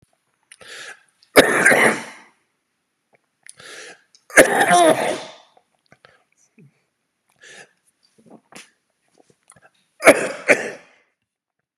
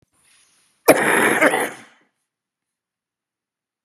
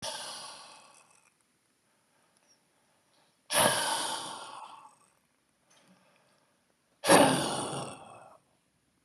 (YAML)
three_cough_length: 11.8 s
three_cough_amplitude: 32768
three_cough_signal_mean_std_ratio: 0.3
cough_length: 3.8 s
cough_amplitude: 32768
cough_signal_mean_std_ratio: 0.35
exhalation_length: 9.0 s
exhalation_amplitude: 16677
exhalation_signal_mean_std_ratio: 0.33
survey_phase: beta (2021-08-13 to 2022-03-07)
age: 18-44
gender: Male
wearing_mask: 'No'
symptom_cough_any: true
smoker_status: Never smoked
respiratory_condition_asthma: true
respiratory_condition_other: false
recruitment_source: REACT
submission_delay: 2 days
covid_test_result: Negative
covid_test_method: RT-qPCR
influenza_a_test_result: Negative
influenza_b_test_result: Negative